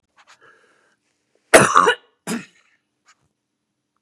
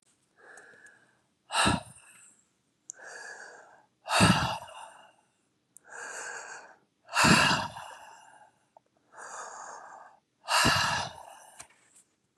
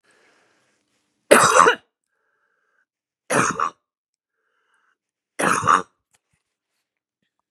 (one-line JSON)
{"cough_length": "4.0 s", "cough_amplitude": 32768, "cough_signal_mean_std_ratio": 0.24, "exhalation_length": "12.4 s", "exhalation_amplitude": 12200, "exhalation_signal_mean_std_ratio": 0.37, "three_cough_length": "7.5 s", "three_cough_amplitude": 32768, "three_cough_signal_mean_std_ratio": 0.28, "survey_phase": "beta (2021-08-13 to 2022-03-07)", "age": "45-64", "gender": "Female", "wearing_mask": "No", "symptom_cough_any": true, "symptom_shortness_of_breath": true, "symptom_fatigue": true, "symptom_headache": true, "symptom_onset": "4 days", "smoker_status": "Never smoked", "respiratory_condition_asthma": false, "respiratory_condition_other": false, "recruitment_source": "Test and Trace", "submission_delay": "2 days", "covid_test_result": "Positive", "covid_test_method": "RT-qPCR", "covid_ct_value": 17.0, "covid_ct_gene": "ORF1ab gene", "covid_ct_mean": 17.3, "covid_viral_load": "2100000 copies/ml", "covid_viral_load_category": "High viral load (>1M copies/ml)"}